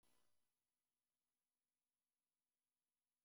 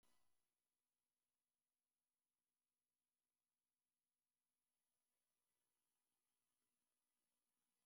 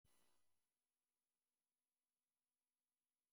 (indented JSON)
{
  "cough_length": "3.2 s",
  "cough_amplitude": 15,
  "cough_signal_mean_std_ratio": 0.45,
  "exhalation_length": "7.9 s",
  "exhalation_amplitude": 13,
  "exhalation_signal_mean_std_ratio": 0.42,
  "three_cough_length": "3.3 s",
  "three_cough_amplitude": 15,
  "three_cough_signal_mean_std_ratio": 0.48,
  "survey_phase": "beta (2021-08-13 to 2022-03-07)",
  "age": "45-64",
  "gender": "Female",
  "wearing_mask": "No",
  "symptom_none": true,
  "smoker_status": "Ex-smoker",
  "respiratory_condition_asthma": false,
  "respiratory_condition_other": false,
  "recruitment_source": "REACT",
  "submission_delay": "1 day",
  "covid_test_result": "Negative",
  "covid_test_method": "RT-qPCR"
}